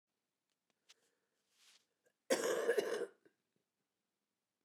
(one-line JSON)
{"cough_length": "4.6 s", "cough_amplitude": 3501, "cough_signal_mean_std_ratio": 0.31, "survey_phase": "beta (2021-08-13 to 2022-03-07)", "age": "65+", "gender": "Female", "wearing_mask": "No", "symptom_none": true, "smoker_status": "Never smoked", "respiratory_condition_asthma": true, "respiratory_condition_other": false, "recruitment_source": "REACT", "submission_delay": "1 day", "covid_test_result": "Negative", "covid_test_method": "RT-qPCR"}